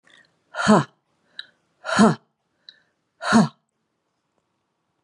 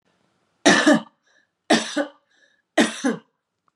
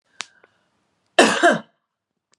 {"exhalation_length": "5.0 s", "exhalation_amplitude": 26426, "exhalation_signal_mean_std_ratio": 0.29, "three_cough_length": "3.8 s", "three_cough_amplitude": 28503, "three_cough_signal_mean_std_ratio": 0.37, "cough_length": "2.4 s", "cough_amplitude": 32695, "cough_signal_mean_std_ratio": 0.3, "survey_phase": "beta (2021-08-13 to 2022-03-07)", "age": "45-64", "gender": "Female", "wearing_mask": "No", "symptom_none": true, "smoker_status": "Ex-smoker", "respiratory_condition_asthma": false, "respiratory_condition_other": false, "recruitment_source": "Test and Trace", "submission_delay": "0 days", "covid_test_result": "Negative", "covid_test_method": "LFT"}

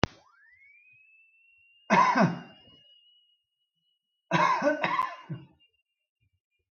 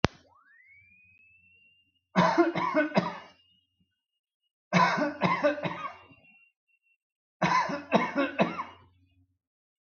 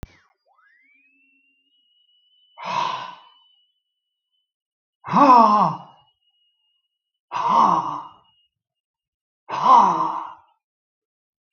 {"cough_length": "6.7 s", "cough_amplitude": 22030, "cough_signal_mean_std_ratio": 0.36, "three_cough_length": "9.8 s", "three_cough_amplitude": 23611, "three_cough_signal_mean_std_ratio": 0.43, "exhalation_length": "11.5 s", "exhalation_amplitude": 26560, "exhalation_signal_mean_std_ratio": 0.34, "survey_phase": "alpha (2021-03-01 to 2021-08-12)", "age": "65+", "gender": "Male", "wearing_mask": "No", "symptom_none": true, "smoker_status": "Never smoked", "respiratory_condition_asthma": false, "respiratory_condition_other": false, "recruitment_source": "REACT", "submission_delay": "3 days", "covid_test_result": "Negative", "covid_test_method": "RT-qPCR"}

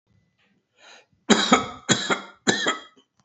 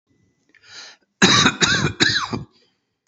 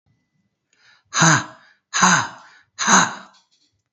{"three_cough_length": "3.2 s", "three_cough_amplitude": 29038, "three_cough_signal_mean_std_ratio": 0.39, "cough_length": "3.1 s", "cough_amplitude": 30340, "cough_signal_mean_std_ratio": 0.46, "exhalation_length": "3.9 s", "exhalation_amplitude": 32767, "exhalation_signal_mean_std_ratio": 0.39, "survey_phase": "beta (2021-08-13 to 2022-03-07)", "age": "45-64", "gender": "Male", "wearing_mask": "No", "symptom_cough_any": true, "symptom_runny_or_blocked_nose": true, "symptom_sore_throat": true, "symptom_diarrhoea": true, "symptom_fatigue": true, "symptom_headache": true, "smoker_status": "Never smoked", "respiratory_condition_asthma": false, "respiratory_condition_other": false, "recruitment_source": "Test and Trace", "submission_delay": "2 days", "covid_test_result": "Positive", "covid_test_method": "LFT"}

